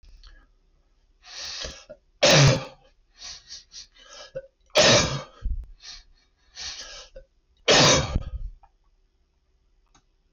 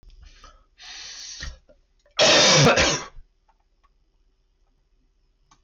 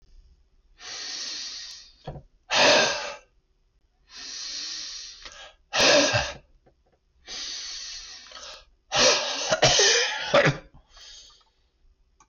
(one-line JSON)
{"three_cough_length": "10.3 s", "three_cough_amplitude": 14686, "three_cough_signal_mean_std_ratio": 0.37, "cough_length": "5.6 s", "cough_amplitude": 13233, "cough_signal_mean_std_ratio": 0.37, "exhalation_length": "12.3 s", "exhalation_amplitude": 12401, "exhalation_signal_mean_std_ratio": 0.46, "survey_phase": "beta (2021-08-13 to 2022-03-07)", "age": "65+", "gender": "Male", "wearing_mask": "No", "symptom_cough_any": true, "smoker_status": "Never smoked", "respiratory_condition_asthma": false, "respiratory_condition_other": false, "recruitment_source": "Test and Trace", "submission_delay": "2 days", "covid_test_result": "Positive", "covid_test_method": "RT-qPCR"}